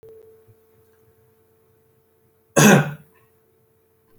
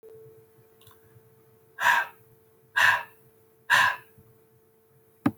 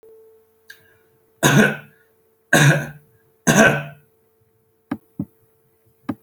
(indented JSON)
{
  "cough_length": "4.2 s",
  "cough_amplitude": 30869,
  "cough_signal_mean_std_ratio": 0.23,
  "exhalation_length": "5.4 s",
  "exhalation_amplitude": 12907,
  "exhalation_signal_mean_std_ratio": 0.33,
  "three_cough_length": "6.2 s",
  "three_cough_amplitude": 29430,
  "three_cough_signal_mean_std_ratio": 0.34,
  "survey_phase": "beta (2021-08-13 to 2022-03-07)",
  "age": "65+",
  "gender": "Male",
  "wearing_mask": "No",
  "symptom_none": true,
  "smoker_status": "Current smoker (11 or more cigarettes per day)",
  "respiratory_condition_asthma": false,
  "respiratory_condition_other": false,
  "recruitment_source": "REACT",
  "submission_delay": "2 days",
  "covid_test_result": "Negative",
  "covid_test_method": "RT-qPCR"
}